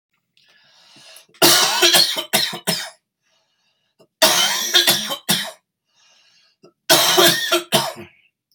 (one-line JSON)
{"three_cough_length": "8.5 s", "three_cough_amplitude": 32768, "three_cough_signal_mean_std_ratio": 0.48, "survey_phase": "beta (2021-08-13 to 2022-03-07)", "age": "45-64", "gender": "Male", "wearing_mask": "No", "symptom_cough_any": true, "symptom_new_continuous_cough": true, "symptom_change_to_sense_of_smell_or_taste": true, "symptom_loss_of_taste": true, "smoker_status": "Ex-smoker", "respiratory_condition_asthma": false, "respiratory_condition_other": false, "recruitment_source": "Test and Trace", "submission_delay": "-1 day", "covid_test_result": "Positive", "covid_test_method": "LFT"}